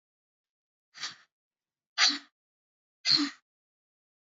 {"exhalation_length": "4.4 s", "exhalation_amplitude": 11287, "exhalation_signal_mean_std_ratio": 0.25, "survey_phase": "alpha (2021-03-01 to 2021-08-12)", "age": "45-64", "gender": "Female", "wearing_mask": "No", "symptom_cough_any": true, "symptom_onset": "6 days", "smoker_status": "Never smoked", "respiratory_condition_asthma": false, "respiratory_condition_other": false, "recruitment_source": "Test and Trace", "submission_delay": "2 days", "covid_test_result": "Positive", "covid_test_method": "RT-qPCR"}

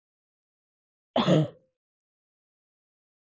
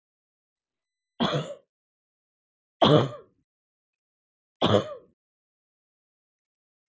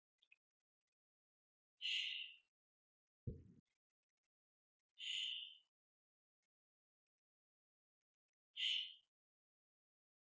{"cough_length": "3.3 s", "cough_amplitude": 11170, "cough_signal_mean_std_ratio": 0.24, "three_cough_length": "6.9 s", "three_cough_amplitude": 21105, "three_cough_signal_mean_std_ratio": 0.24, "exhalation_length": "10.2 s", "exhalation_amplitude": 874, "exhalation_signal_mean_std_ratio": 0.29, "survey_phase": "alpha (2021-03-01 to 2021-08-12)", "age": "45-64", "gender": "Female", "wearing_mask": "No", "symptom_none": true, "smoker_status": "Never smoked", "respiratory_condition_asthma": false, "respiratory_condition_other": false, "recruitment_source": "REACT", "submission_delay": "1 day", "covid_test_result": "Negative", "covid_test_method": "RT-qPCR"}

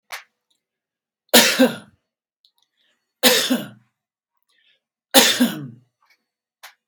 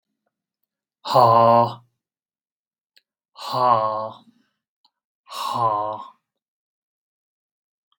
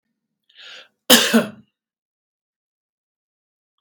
{"three_cough_length": "6.9 s", "three_cough_amplitude": 32768, "three_cough_signal_mean_std_ratio": 0.31, "exhalation_length": "8.0 s", "exhalation_amplitude": 31510, "exhalation_signal_mean_std_ratio": 0.35, "cough_length": "3.8 s", "cough_amplitude": 32768, "cough_signal_mean_std_ratio": 0.23, "survey_phase": "beta (2021-08-13 to 2022-03-07)", "age": "45-64", "gender": "Male", "wearing_mask": "No", "symptom_none": true, "smoker_status": "Never smoked", "respiratory_condition_asthma": false, "respiratory_condition_other": false, "recruitment_source": "REACT", "submission_delay": "1 day", "covid_test_result": "Negative", "covid_test_method": "RT-qPCR", "influenza_a_test_result": "Negative", "influenza_b_test_result": "Negative"}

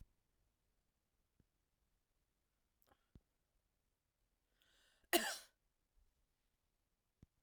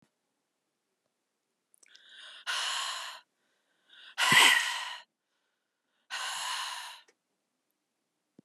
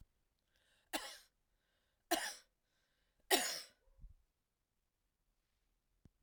{"cough_length": "7.4 s", "cough_amplitude": 4191, "cough_signal_mean_std_ratio": 0.14, "exhalation_length": "8.4 s", "exhalation_amplitude": 13379, "exhalation_signal_mean_std_ratio": 0.32, "three_cough_length": "6.2 s", "three_cough_amplitude": 5535, "three_cough_signal_mean_std_ratio": 0.24, "survey_phase": "beta (2021-08-13 to 2022-03-07)", "age": "45-64", "gender": "Female", "wearing_mask": "No", "symptom_cough_any": true, "symptom_sore_throat": true, "symptom_fatigue": true, "symptom_change_to_sense_of_smell_or_taste": true, "smoker_status": "Never smoked", "respiratory_condition_asthma": false, "respiratory_condition_other": false, "recruitment_source": "Test and Trace", "submission_delay": "3 days", "covid_test_result": "Positive", "covid_test_method": "RT-qPCR", "covid_ct_value": 17.5, "covid_ct_gene": "ORF1ab gene", "covid_ct_mean": 18.0, "covid_viral_load": "1300000 copies/ml", "covid_viral_load_category": "High viral load (>1M copies/ml)"}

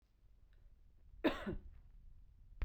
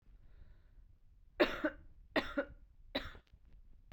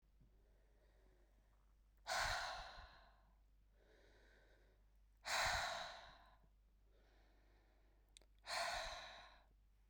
{"cough_length": "2.6 s", "cough_amplitude": 3018, "cough_signal_mean_std_ratio": 0.4, "three_cough_length": "3.9 s", "three_cough_amplitude": 5206, "three_cough_signal_mean_std_ratio": 0.36, "exhalation_length": "9.9 s", "exhalation_amplitude": 1305, "exhalation_signal_mean_std_ratio": 0.43, "survey_phase": "beta (2021-08-13 to 2022-03-07)", "age": "18-44", "gender": "Female", "wearing_mask": "No", "symptom_new_continuous_cough": true, "symptom_runny_or_blocked_nose": true, "symptom_sore_throat": true, "symptom_fatigue": true, "symptom_headache": true, "symptom_change_to_sense_of_smell_or_taste": true, "symptom_loss_of_taste": true, "symptom_onset": "3 days", "smoker_status": "Current smoker (e-cigarettes or vapes only)", "respiratory_condition_asthma": false, "respiratory_condition_other": false, "recruitment_source": "Test and Trace", "submission_delay": "1 day", "covid_test_result": "Positive", "covid_test_method": "RT-qPCR"}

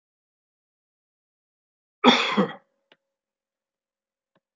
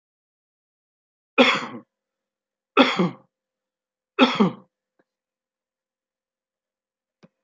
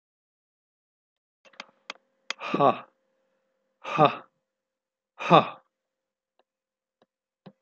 {"cough_length": "4.6 s", "cough_amplitude": 24167, "cough_signal_mean_std_ratio": 0.22, "three_cough_length": "7.4 s", "three_cough_amplitude": 26963, "three_cough_signal_mean_std_ratio": 0.25, "exhalation_length": "7.6 s", "exhalation_amplitude": 25686, "exhalation_signal_mean_std_ratio": 0.21, "survey_phase": "beta (2021-08-13 to 2022-03-07)", "age": "65+", "gender": "Male", "wearing_mask": "No", "symptom_none": true, "smoker_status": "Never smoked", "respiratory_condition_asthma": false, "respiratory_condition_other": false, "recruitment_source": "REACT", "submission_delay": "1 day", "covid_test_result": "Negative", "covid_test_method": "RT-qPCR", "influenza_a_test_result": "Negative", "influenza_b_test_result": "Negative"}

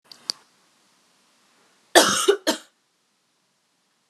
{"cough_length": "4.1 s", "cough_amplitude": 31958, "cough_signal_mean_std_ratio": 0.25, "survey_phase": "alpha (2021-03-01 to 2021-08-12)", "age": "18-44", "gender": "Female", "wearing_mask": "No", "symptom_cough_any": true, "symptom_fatigue": true, "symptom_headache": true, "symptom_onset": "3 days", "smoker_status": "Never smoked", "respiratory_condition_asthma": false, "respiratory_condition_other": false, "recruitment_source": "Test and Trace", "submission_delay": "1 day", "covid_test_result": "Positive", "covid_test_method": "RT-qPCR", "covid_ct_value": 18.2, "covid_ct_gene": "ORF1ab gene", "covid_ct_mean": 18.7, "covid_viral_load": "720000 copies/ml", "covid_viral_load_category": "Low viral load (10K-1M copies/ml)"}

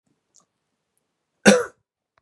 {"cough_length": "2.2 s", "cough_amplitude": 32767, "cough_signal_mean_std_ratio": 0.21, "survey_phase": "beta (2021-08-13 to 2022-03-07)", "age": "45-64", "gender": "Male", "wearing_mask": "No", "symptom_none": true, "smoker_status": "Ex-smoker", "respiratory_condition_asthma": false, "respiratory_condition_other": false, "recruitment_source": "REACT", "submission_delay": "1 day", "covid_test_result": "Negative", "covid_test_method": "RT-qPCR", "influenza_a_test_result": "Negative", "influenza_b_test_result": "Negative"}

